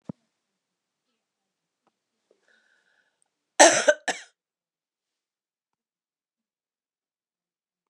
{
  "cough_length": "7.9 s",
  "cough_amplitude": 32606,
  "cough_signal_mean_std_ratio": 0.15,
  "survey_phase": "beta (2021-08-13 to 2022-03-07)",
  "age": "65+",
  "gender": "Female",
  "wearing_mask": "No",
  "symptom_cough_any": true,
  "symptom_runny_or_blocked_nose": true,
  "symptom_diarrhoea": true,
  "symptom_other": true,
  "smoker_status": "Never smoked",
  "respiratory_condition_asthma": false,
  "respiratory_condition_other": false,
  "recruitment_source": "Test and Trace",
  "submission_delay": "1 day",
  "covid_test_result": "Positive",
  "covid_test_method": "LFT"
}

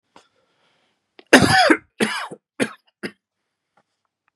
{
  "cough_length": "4.4 s",
  "cough_amplitude": 32768,
  "cough_signal_mean_std_ratio": 0.3,
  "survey_phase": "beta (2021-08-13 to 2022-03-07)",
  "age": "45-64",
  "gender": "Male",
  "wearing_mask": "No",
  "symptom_none": true,
  "symptom_onset": "8 days",
  "smoker_status": "Ex-smoker",
  "respiratory_condition_asthma": false,
  "respiratory_condition_other": false,
  "recruitment_source": "REACT",
  "submission_delay": "1 day",
  "covid_test_result": "Negative",
  "covid_test_method": "RT-qPCR",
  "influenza_a_test_result": "Negative",
  "influenza_b_test_result": "Negative"
}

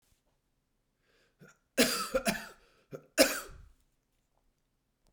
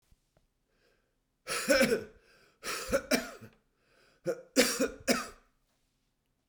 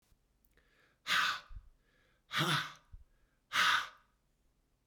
{
  "cough_length": "5.1 s",
  "cough_amplitude": 14045,
  "cough_signal_mean_std_ratio": 0.28,
  "three_cough_length": "6.5 s",
  "three_cough_amplitude": 9412,
  "three_cough_signal_mean_std_ratio": 0.38,
  "exhalation_length": "4.9 s",
  "exhalation_amplitude": 4003,
  "exhalation_signal_mean_std_ratio": 0.39,
  "survey_phase": "beta (2021-08-13 to 2022-03-07)",
  "age": "65+",
  "gender": "Male",
  "wearing_mask": "No",
  "symptom_cough_any": true,
  "symptom_fatigue": true,
  "symptom_headache": true,
  "symptom_other": true,
  "symptom_onset": "4 days",
  "smoker_status": "Never smoked",
  "respiratory_condition_asthma": false,
  "respiratory_condition_other": false,
  "recruitment_source": "Test and Trace",
  "submission_delay": "2 days",
  "covid_test_result": "Positive",
  "covid_test_method": "RT-qPCR",
  "covid_ct_value": 22.8,
  "covid_ct_gene": "ORF1ab gene"
}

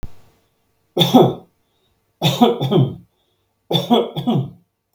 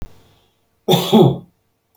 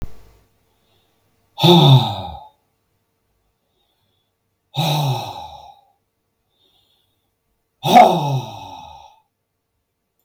{
  "three_cough_length": "4.9 s",
  "three_cough_amplitude": 32768,
  "three_cough_signal_mean_std_ratio": 0.46,
  "cough_length": "2.0 s",
  "cough_amplitude": 32766,
  "cough_signal_mean_std_ratio": 0.39,
  "exhalation_length": "10.2 s",
  "exhalation_amplitude": 32768,
  "exhalation_signal_mean_std_ratio": 0.31,
  "survey_phase": "beta (2021-08-13 to 2022-03-07)",
  "age": "65+",
  "gender": "Male",
  "wearing_mask": "No",
  "symptom_none": true,
  "smoker_status": "Ex-smoker",
  "respiratory_condition_asthma": false,
  "respiratory_condition_other": false,
  "recruitment_source": "REACT",
  "submission_delay": "1 day",
  "covid_test_result": "Negative",
  "covid_test_method": "RT-qPCR",
  "influenza_a_test_result": "Negative",
  "influenza_b_test_result": "Negative"
}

